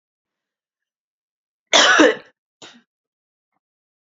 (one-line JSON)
{"cough_length": "4.1 s", "cough_amplitude": 29584, "cough_signal_mean_std_ratio": 0.26, "survey_phase": "beta (2021-08-13 to 2022-03-07)", "age": "18-44", "gender": "Female", "wearing_mask": "No", "symptom_cough_any": true, "symptom_headache": true, "symptom_change_to_sense_of_smell_or_taste": true, "symptom_loss_of_taste": true, "symptom_other": true, "smoker_status": "Never smoked", "respiratory_condition_asthma": false, "respiratory_condition_other": false, "recruitment_source": "Test and Trace", "submission_delay": "3 days", "covid_test_result": "Positive", "covid_test_method": "ePCR"}